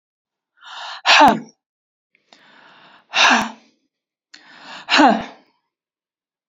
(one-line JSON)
{"exhalation_length": "6.5 s", "exhalation_amplitude": 30956, "exhalation_signal_mean_std_ratio": 0.32, "survey_phase": "beta (2021-08-13 to 2022-03-07)", "age": "65+", "gender": "Female", "wearing_mask": "No", "symptom_sore_throat": true, "symptom_onset": "6 days", "smoker_status": "Never smoked", "respiratory_condition_asthma": false, "respiratory_condition_other": false, "recruitment_source": "REACT", "submission_delay": "3 days", "covid_test_result": "Negative", "covid_test_method": "RT-qPCR"}